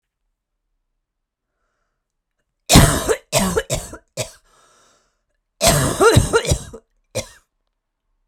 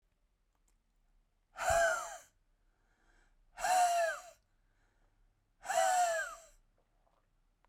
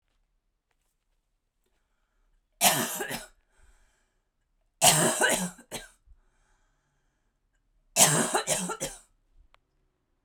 {
  "cough_length": "8.3 s",
  "cough_amplitude": 32768,
  "cough_signal_mean_std_ratio": 0.35,
  "exhalation_length": "7.7 s",
  "exhalation_amplitude": 3496,
  "exhalation_signal_mean_std_ratio": 0.42,
  "three_cough_length": "10.2 s",
  "three_cough_amplitude": 21686,
  "three_cough_signal_mean_std_ratio": 0.33,
  "survey_phase": "beta (2021-08-13 to 2022-03-07)",
  "age": "45-64",
  "gender": "Female",
  "wearing_mask": "No",
  "symptom_cough_any": true,
  "symptom_abdominal_pain": true,
  "symptom_fatigue": true,
  "symptom_headache": true,
  "symptom_onset": "12 days",
  "smoker_status": "Ex-smoker",
  "respiratory_condition_asthma": true,
  "respiratory_condition_other": false,
  "recruitment_source": "REACT",
  "submission_delay": "2 days",
  "covid_test_result": "Negative",
  "covid_test_method": "RT-qPCR"
}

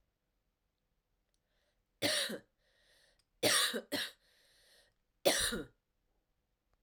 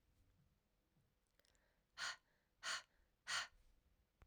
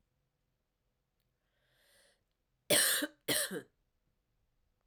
{
  "three_cough_length": "6.8 s",
  "three_cough_amplitude": 6015,
  "three_cough_signal_mean_std_ratio": 0.33,
  "exhalation_length": "4.3 s",
  "exhalation_amplitude": 968,
  "exhalation_signal_mean_std_ratio": 0.31,
  "cough_length": "4.9 s",
  "cough_amplitude": 5660,
  "cough_signal_mean_std_ratio": 0.28,
  "survey_phase": "alpha (2021-03-01 to 2021-08-12)",
  "age": "18-44",
  "gender": "Female",
  "wearing_mask": "No",
  "symptom_cough_any": true,
  "symptom_new_continuous_cough": true,
  "symptom_fatigue": true,
  "symptom_headache": true,
  "symptom_onset": "3 days",
  "smoker_status": "Current smoker (e-cigarettes or vapes only)",
  "respiratory_condition_asthma": false,
  "respiratory_condition_other": false,
  "recruitment_source": "Test and Trace",
  "submission_delay": "1 day",
  "covid_test_result": "Positive",
  "covid_test_method": "RT-qPCR",
  "covid_ct_value": 22.4,
  "covid_ct_gene": "ORF1ab gene",
  "covid_ct_mean": 23.2,
  "covid_viral_load": "24000 copies/ml",
  "covid_viral_load_category": "Low viral load (10K-1M copies/ml)"
}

